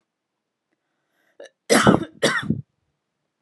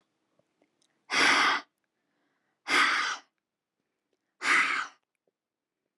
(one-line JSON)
{"cough_length": "3.4 s", "cough_amplitude": 30966, "cough_signal_mean_std_ratio": 0.31, "exhalation_length": "6.0 s", "exhalation_amplitude": 9313, "exhalation_signal_mean_std_ratio": 0.39, "survey_phase": "beta (2021-08-13 to 2022-03-07)", "age": "18-44", "gender": "Female", "wearing_mask": "No", "symptom_headache": true, "smoker_status": "Never smoked", "respiratory_condition_asthma": false, "respiratory_condition_other": false, "recruitment_source": "REACT", "submission_delay": "1 day", "covid_test_result": "Negative", "covid_test_method": "RT-qPCR", "influenza_a_test_result": "Negative", "influenza_b_test_result": "Negative"}